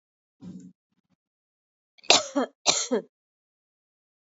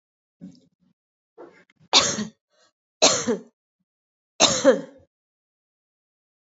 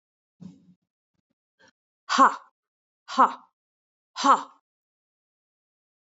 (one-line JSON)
{"cough_length": "4.4 s", "cough_amplitude": 30801, "cough_signal_mean_std_ratio": 0.26, "three_cough_length": "6.6 s", "three_cough_amplitude": 27569, "three_cough_signal_mean_std_ratio": 0.28, "exhalation_length": "6.1 s", "exhalation_amplitude": 18560, "exhalation_signal_mean_std_ratio": 0.22, "survey_phase": "alpha (2021-03-01 to 2021-08-12)", "age": "45-64", "gender": "Female", "wearing_mask": "No", "symptom_none": true, "smoker_status": "Never smoked", "respiratory_condition_asthma": false, "respiratory_condition_other": false, "recruitment_source": "REACT", "submission_delay": "1 day", "covid_test_result": "Negative", "covid_test_method": "RT-qPCR"}